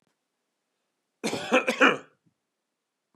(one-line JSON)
{"cough_length": "3.2 s", "cough_amplitude": 20523, "cough_signal_mean_std_ratio": 0.29, "survey_phase": "beta (2021-08-13 to 2022-03-07)", "age": "45-64", "gender": "Male", "wearing_mask": "No", "symptom_none": true, "smoker_status": "Never smoked", "respiratory_condition_asthma": false, "respiratory_condition_other": false, "recruitment_source": "REACT", "submission_delay": "1 day", "covid_test_result": "Negative", "covid_test_method": "RT-qPCR", "influenza_a_test_result": "Negative", "influenza_b_test_result": "Negative"}